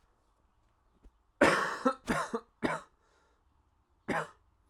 {"cough_length": "4.7 s", "cough_amplitude": 11703, "cough_signal_mean_std_ratio": 0.35, "survey_phase": "alpha (2021-03-01 to 2021-08-12)", "age": "18-44", "gender": "Male", "wearing_mask": "No", "symptom_cough_any": true, "symptom_fever_high_temperature": true, "smoker_status": "Prefer not to say", "respiratory_condition_asthma": false, "respiratory_condition_other": false, "recruitment_source": "Test and Trace", "submission_delay": "2 days", "covid_test_result": "Positive", "covid_test_method": "LFT"}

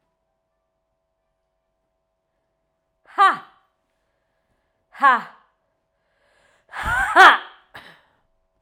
{"exhalation_length": "8.6 s", "exhalation_amplitude": 32768, "exhalation_signal_mean_std_ratio": 0.23, "survey_phase": "beta (2021-08-13 to 2022-03-07)", "age": "18-44", "gender": "Female", "wearing_mask": "No", "symptom_cough_any": true, "symptom_runny_or_blocked_nose": true, "symptom_shortness_of_breath": true, "symptom_sore_throat": true, "symptom_abdominal_pain": true, "symptom_fatigue": true, "symptom_fever_high_temperature": true, "symptom_headache": true, "symptom_change_to_sense_of_smell_or_taste": true, "symptom_onset": "3 days", "smoker_status": "Never smoked", "respiratory_condition_asthma": false, "respiratory_condition_other": false, "recruitment_source": "Test and Trace", "submission_delay": "1 day", "covid_test_result": "Positive", "covid_test_method": "RT-qPCR"}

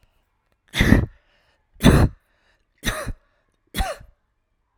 {"three_cough_length": "4.8 s", "three_cough_amplitude": 32768, "three_cough_signal_mean_std_ratio": 0.32, "survey_phase": "alpha (2021-03-01 to 2021-08-12)", "age": "18-44", "gender": "Female", "wearing_mask": "No", "symptom_none": true, "smoker_status": "Never smoked", "respiratory_condition_asthma": false, "respiratory_condition_other": false, "recruitment_source": "REACT", "submission_delay": "2 days", "covid_test_result": "Negative", "covid_test_method": "RT-qPCR"}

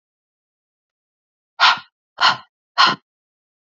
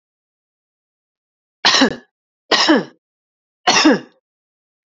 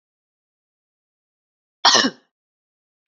{"exhalation_length": "3.8 s", "exhalation_amplitude": 30673, "exhalation_signal_mean_std_ratio": 0.28, "three_cough_length": "4.9 s", "three_cough_amplitude": 32767, "three_cough_signal_mean_std_ratio": 0.35, "cough_length": "3.1 s", "cough_amplitude": 30199, "cough_signal_mean_std_ratio": 0.22, "survey_phase": "beta (2021-08-13 to 2022-03-07)", "age": "18-44", "gender": "Female", "wearing_mask": "No", "symptom_sore_throat": true, "symptom_headache": true, "symptom_onset": "5 days", "smoker_status": "Never smoked", "respiratory_condition_asthma": true, "respiratory_condition_other": false, "recruitment_source": "Test and Trace", "submission_delay": "1 day", "covid_test_result": "Positive", "covid_test_method": "RT-qPCR", "covid_ct_value": 33.4, "covid_ct_gene": "ORF1ab gene"}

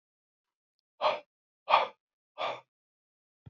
{"exhalation_length": "3.5 s", "exhalation_amplitude": 15416, "exhalation_signal_mean_std_ratio": 0.27, "survey_phase": "beta (2021-08-13 to 2022-03-07)", "age": "65+", "gender": "Male", "wearing_mask": "No", "symptom_none": true, "smoker_status": "Current smoker (11 or more cigarettes per day)", "respiratory_condition_asthma": false, "respiratory_condition_other": false, "recruitment_source": "REACT", "submission_delay": "0 days", "covid_test_result": "Negative", "covid_test_method": "RT-qPCR", "influenza_a_test_result": "Negative", "influenza_b_test_result": "Negative"}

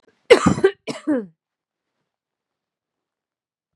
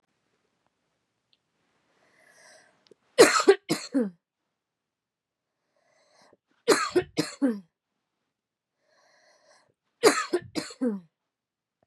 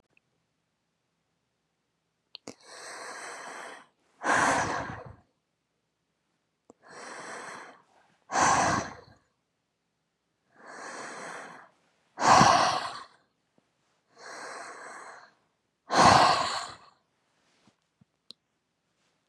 {"cough_length": "3.8 s", "cough_amplitude": 32768, "cough_signal_mean_std_ratio": 0.25, "three_cough_length": "11.9 s", "three_cough_amplitude": 26749, "three_cough_signal_mean_std_ratio": 0.26, "exhalation_length": "19.3 s", "exhalation_amplitude": 17196, "exhalation_signal_mean_std_ratio": 0.32, "survey_phase": "beta (2021-08-13 to 2022-03-07)", "age": "18-44", "gender": "Female", "wearing_mask": "No", "symptom_cough_any": true, "symptom_runny_or_blocked_nose": true, "symptom_onset": "12 days", "smoker_status": "Never smoked", "respiratory_condition_asthma": false, "respiratory_condition_other": false, "recruitment_source": "REACT", "submission_delay": "1 day", "covid_test_result": "Negative", "covid_test_method": "RT-qPCR", "influenza_a_test_result": "Negative", "influenza_b_test_result": "Negative"}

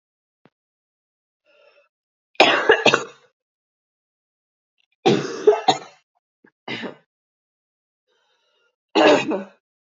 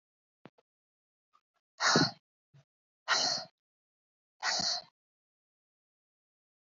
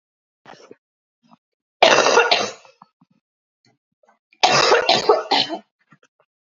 {"three_cough_length": "10.0 s", "three_cough_amplitude": 32768, "three_cough_signal_mean_std_ratio": 0.29, "exhalation_length": "6.7 s", "exhalation_amplitude": 7415, "exhalation_signal_mean_std_ratio": 0.3, "cough_length": "6.6 s", "cough_amplitude": 32768, "cough_signal_mean_std_ratio": 0.38, "survey_phase": "alpha (2021-03-01 to 2021-08-12)", "age": "18-44", "gender": "Female", "wearing_mask": "No", "symptom_cough_any": true, "symptom_fatigue": true, "symptom_change_to_sense_of_smell_or_taste": true, "symptom_onset": "3 days", "smoker_status": "Never smoked", "respiratory_condition_asthma": false, "respiratory_condition_other": false, "recruitment_source": "Test and Trace", "submission_delay": "1 day", "covid_test_result": "Positive", "covid_test_method": "RT-qPCR", "covid_ct_value": 25.5, "covid_ct_gene": "N gene"}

